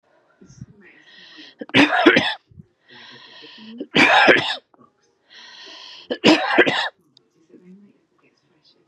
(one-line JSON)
{"three_cough_length": "8.9 s", "three_cough_amplitude": 32768, "three_cough_signal_mean_std_ratio": 0.37, "survey_phase": "beta (2021-08-13 to 2022-03-07)", "age": "18-44", "gender": "Female", "wearing_mask": "No", "symptom_cough_any": true, "symptom_shortness_of_breath": true, "symptom_fatigue": true, "symptom_change_to_sense_of_smell_or_taste": true, "symptom_onset": "13 days", "smoker_status": "Ex-smoker", "respiratory_condition_asthma": false, "respiratory_condition_other": false, "recruitment_source": "REACT", "submission_delay": "0 days", "covid_test_result": "Negative", "covid_test_method": "RT-qPCR"}